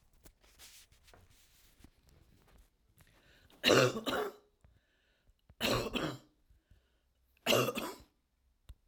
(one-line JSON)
{"three_cough_length": "8.9 s", "three_cough_amplitude": 9011, "three_cough_signal_mean_std_ratio": 0.32, "survey_phase": "alpha (2021-03-01 to 2021-08-12)", "age": "65+", "gender": "Female", "wearing_mask": "No", "symptom_none": true, "smoker_status": "Never smoked", "respiratory_condition_asthma": false, "respiratory_condition_other": false, "recruitment_source": "REACT", "submission_delay": "3 days", "covid_test_result": "Negative", "covid_test_method": "RT-qPCR"}